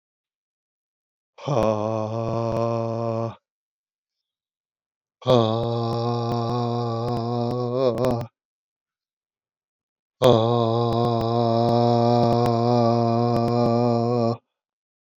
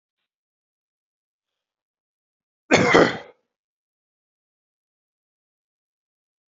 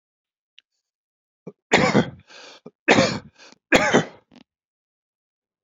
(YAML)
exhalation_length: 15.2 s
exhalation_amplitude: 23134
exhalation_signal_mean_std_ratio: 0.66
cough_length: 6.6 s
cough_amplitude: 27310
cough_signal_mean_std_ratio: 0.19
three_cough_length: 5.6 s
three_cough_amplitude: 28531
three_cough_signal_mean_std_ratio: 0.32
survey_phase: beta (2021-08-13 to 2022-03-07)
age: 65+
gender: Male
wearing_mask: 'No'
symptom_none: true
smoker_status: Never smoked
respiratory_condition_asthma: false
respiratory_condition_other: false
recruitment_source: REACT
submission_delay: 0 days
covid_test_result: Negative
covid_test_method: RT-qPCR
influenza_a_test_result: Negative
influenza_b_test_result: Negative